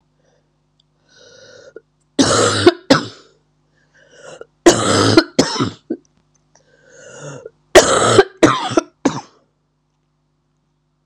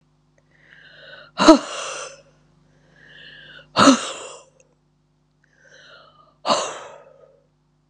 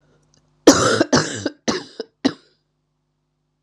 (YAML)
three_cough_length: 11.1 s
three_cough_amplitude: 32768
three_cough_signal_mean_std_ratio: 0.35
exhalation_length: 7.9 s
exhalation_amplitude: 32768
exhalation_signal_mean_std_ratio: 0.26
cough_length: 3.6 s
cough_amplitude: 32768
cough_signal_mean_std_ratio: 0.34
survey_phase: beta (2021-08-13 to 2022-03-07)
age: 45-64
gender: Female
wearing_mask: 'No'
symptom_cough_any: true
symptom_runny_or_blocked_nose: true
symptom_shortness_of_breath: true
symptom_sore_throat: true
symptom_fatigue: true
symptom_onset: 3 days
smoker_status: Ex-smoker
respiratory_condition_asthma: true
respiratory_condition_other: false
recruitment_source: Test and Trace
submission_delay: 1 day
covid_test_result: Positive
covid_test_method: RT-qPCR
covid_ct_value: 19.9
covid_ct_gene: ORF1ab gene
covid_ct_mean: 20.3
covid_viral_load: 220000 copies/ml
covid_viral_load_category: Low viral load (10K-1M copies/ml)